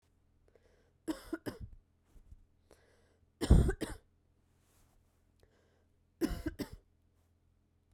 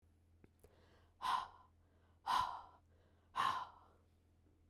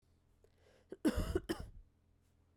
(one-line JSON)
{"three_cough_length": "7.9 s", "three_cough_amplitude": 8940, "three_cough_signal_mean_std_ratio": 0.23, "exhalation_length": "4.7 s", "exhalation_amplitude": 1913, "exhalation_signal_mean_std_ratio": 0.38, "cough_length": "2.6 s", "cough_amplitude": 2623, "cough_signal_mean_std_ratio": 0.35, "survey_phase": "beta (2021-08-13 to 2022-03-07)", "age": "18-44", "gender": "Female", "wearing_mask": "No", "symptom_none": true, "symptom_onset": "9 days", "smoker_status": "Never smoked", "respiratory_condition_asthma": true, "respiratory_condition_other": false, "recruitment_source": "REACT", "submission_delay": "2 days", "covid_test_result": "Negative", "covid_test_method": "RT-qPCR"}